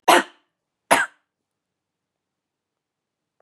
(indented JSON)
{
  "cough_length": "3.4 s",
  "cough_amplitude": 30052,
  "cough_signal_mean_std_ratio": 0.22,
  "survey_phase": "beta (2021-08-13 to 2022-03-07)",
  "age": "45-64",
  "gender": "Female",
  "wearing_mask": "No",
  "symptom_none": true,
  "smoker_status": "Ex-smoker",
  "respiratory_condition_asthma": false,
  "respiratory_condition_other": false,
  "recruitment_source": "REACT",
  "submission_delay": "2 days",
  "covid_test_result": "Negative",
  "covid_test_method": "RT-qPCR",
  "influenza_a_test_result": "Negative",
  "influenza_b_test_result": "Negative"
}